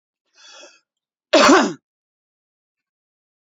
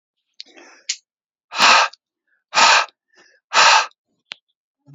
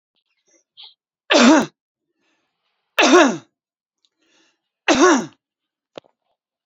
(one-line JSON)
{"cough_length": "3.5 s", "cough_amplitude": 31572, "cough_signal_mean_std_ratio": 0.26, "exhalation_length": "4.9 s", "exhalation_amplitude": 32768, "exhalation_signal_mean_std_ratio": 0.36, "three_cough_length": "6.7 s", "three_cough_amplitude": 29149, "three_cough_signal_mean_std_ratio": 0.32, "survey_phase": "alpha (2021-03-01 to 2021-08-12)", "age": "45-64", "gender": "Male", "wearing_mask": "No", "symptom_none": true, "smoker_status": "Current smoker (e-cigarettes or vapes only)", "respiratory_condition_asthma": false, "respiratory_condition_other": false, "recruitment_source": "REACT", "submission_delay": "2 days", "covid_test_result": "Negative", "covid_test_method": "RT-qPCR"}